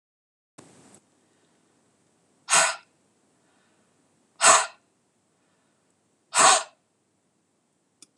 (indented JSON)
{
  "exhalation_length": "8.2 s",
  "exhalation_amplitude": 23791,
  "exhalation_signal_mean_std_ratio": 0.24,
  "survey_phase": "beta (2021-08-13 to 2022-03-07)",
  "age": "45-64",
  "gender": "Female",
  "wearing_mask": "No",
  "symptom_none": true,
  "smoker_status": "Never smoked",
  "respiratory_condition_asthma": false,
  "respiratory_condition_other": false,
  "recruitment_source": "REACT",
  "submission_delay": "1 day",
  "covid_test_result": "Negative",
  "covid_test_method": "RT-qPCR",
  "influenza_a_test_result": "Negative",
  "influenza_b_test_result": "Negative"
}